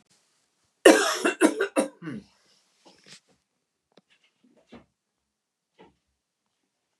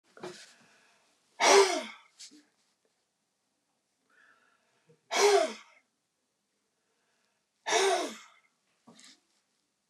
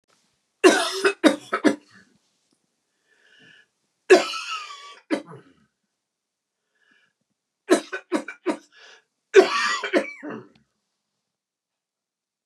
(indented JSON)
{
  "cough_length": "7.0 s",
  "cough_amplitude": 29496,
  "cough_signal_mean_std_ratio": 0.23,
  "exhalation_length": "9.9 s",
  "exhalation_amplitude": 11534,
  "exhalation_signal_mean_std_ratio": 0.28,
  "three_cough_length": "12.5 s",
  "three_cough_amplitude": 29182,
  "three_cough_signal_mean_std_ratio": 0.29,
  "survey_phase": "beta (2021-08-13 to 2022-03-07)",
  "age": "65+",
  "gender": "Male",
  "wearing_mask": "No",
  "symptom_none": true,
  "smoker_status": "Never smoked",
  "respiratory_condition_asthma": false,
  "respiratory_condition_other": false,
  "recruitment_source": "REACT",
  "submission_delay": "2 days",
  "covid_test_result": "Negative",
  "covid_test_method": "RT-qPCR",
  "influenza_a_test_result": "Negative",
  "influenza_b_test_result": "Negative"
}